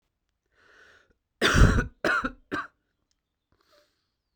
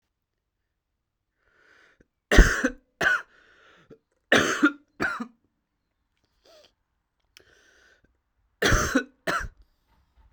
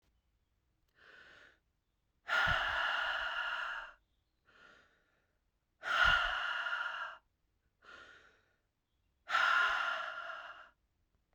{"cough_length": "4.4 s", "cough_amplitude": 17899, "cough_signal_mean_std_ratio": 0.31, "three_cough_length": "10.3 s", "three_cough_amplitude": 28809, "three_cough_signal_mean_std_ratio": 0.28, "exhalation_length": "11.3 s", "exhalation_amplitude": 4538, "exhalation_signal_mean_std_ratio": 0.48, "survey_phase": "beta (2021-08-13 to 2022-03-07)", "age": "18-44", "gender": "Male", "wearing_mask": "No", "symptom_cough_any": true, "symptom_new_continuous_cough": true, "symptom_runny_or_blocked_nose": true, "symptom_fatigue": true, "symptom_fever_high_temperature": true, "symptom_headache": true, "symptom_change_to_sense_of_smell_or_taste": true, "symptom_other": true, "symptom_onset": "3 days", "smoker_status": "Ex-smoker", "respiratory_condition_asthma": false, "respiratory_condition_other": false, "recruitment_source": "Test and Trace", "submission_delay": "3 days", "covid_test_result": "Positive", "covid_test_method": "RT-qPCR"}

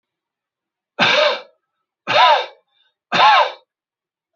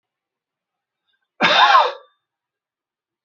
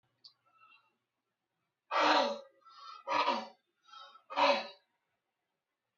{"three_cough_length": "4.4 s", "three_cough_amplitude": 30565, "three_cough_signal_mean_std_ratio": 0.42, "cough_length": "3.2 s", "cough_amplitude": 28883, "cough_signal_mean_std_ratio": 0.32, "exhalation_length": "6.0 s", "exhalation_amplitude": 5457, "exhalation_signal_mean_std_ratio": 0.36, "survey_phase": "beta (2021-08-13 to 2022-03-07)", "age": "45-64", "gender": "Male", "wearing_mask": "No", "symptom_none": true, "smoker_status": "Never smoked", "respiratory_condition_asthma": false, "respiratory_condition_other": false, "recruitment_source": "REACT", "submission_delay": "1 day", "covid_test_result": "Negative", "covid_test_method": "RT-qPCR"}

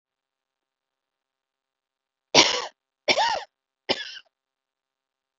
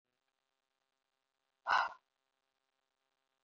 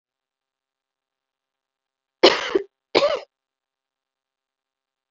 {"three_cough_length": "5.4 s", "three_cough_amplitude": 32768, "three_cough_signal_mean_std_ratio": 0.25, "exhalation_length": "3.4 s", "exhalation_amplitude": 3919, "exhalation_signal_mean_std_ratio": 0.19, "cough_length": "5.1 s", "cough_amplitude": 32768, "cough_signal_mean_std_ratio": 0.22, "survey_phase": "beta (2021-08-13 to 2022-03-07)", "age": "45-64", "gender": "Female", "wearing_mask": "No", "symptom_fatigue": true, "smoker_status": "Prefer not to say", "respiratory_condition_asthma": false, "respiratory_condition_other": false, "recruitment_source": "REACT", "submission_delay": "2 days", "covid_test_result": "Negative", "covid_test_method": "RT-qPCR", "influenza_a_test_result": "Negative", "influenza_b_test_result": "Negative"}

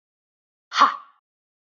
{"exhalation_length": "1.6 s", "exhalation_amplitude": 25952, "exhalation_signal_mean_std_ratio": 0.25, "survey_phase": "beta (2021-08-13 to 2022-03-07)", "age": "18-44", "gender": "Female", "wearing_mask": "No", "symptom_runny_or_blocked_nose": true, "smoker_status": "Never smoked", "respiratory_condition_asthma": false, "respiratory_condition_other": false, "recruitment_source": "REACT", "submission_delay": "3 days", "covid_test_result": "Negative", "covid_test_method": "RT-qPCR"}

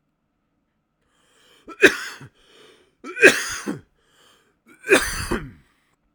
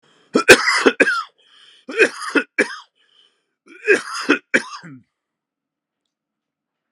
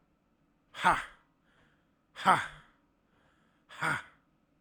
{"three_cough_length": "6.1 s", "three_cough_amplitude": 32768, "three_cough_signal_mean_std_ratio": 0.27, "cough_length": "6.9 s", "cough_amplitude": 32768, "cough_signal_mean_std_ratio": 0.33, "exhalation_length": "4.6 s", "exhalation_amplitude": 11916, "exhalation_signal_mean_std_ratio": 0.28, "survey_phase": "alpha (2021-03-01 to 2021-08-12)", "age": "18-44", "gender": "Male", "wearing_mask": "No", "symptom_none": true, "symptom_onset": "3 days", "smoker_status": "Never smoked", "respiratory_condition_asthma": false, "respiratory_condition_other": false, "recruitment_source": "REACT", "submission_delay": "1 day", "covid_test_result": "Negative", "covid_test_method": "RT-qPCR"}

